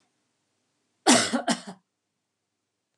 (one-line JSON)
{"cough_length": "3.0 s", "cough_amplitude": 19961, "cough_signal_mean_std_ratio": 0.28, "survey_phase": "beta (2021-08-13 to 2022-03-07)", "age": "45-64", "gender": "Female", "wearing_mask": "No", "symptom_none": true, "smoker_status": "Never smoked", "respiratory_condition_asthma": false, "respiratory_condition_other": false, "recruitment_source": "REACT", "submission_delay": "2 days", "covid_test_result": "Negative", "covid_test_method": "RT-qPCR", "influenza_a_test_result": "Negative", "influenza_b_test_result": "Negative"}